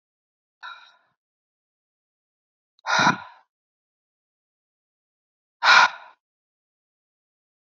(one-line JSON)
{"exhalation_length": "7.8 s", "exhalation_amplitude": 25163, "exhalation_signal_mean_std_ratio": 0.21, "survey_phase": "beta (2021-08-13 to 2022-03-07)", "age": "18-44", "gender": "Female", "wearing_mask": "No", "symptom_none": true, "smoker_status": "Never smoked", "respiratory_condition_asthma": false, "respiratory_condition_other": false, "recruitment_source": "REACT", "submission_delay": "2 days", "covid_test_result": "Negative", "covid_test_method": "RT-qPCR", "influenza_a_test_result": "Negative", "influenza_b_test_result": "Negative"}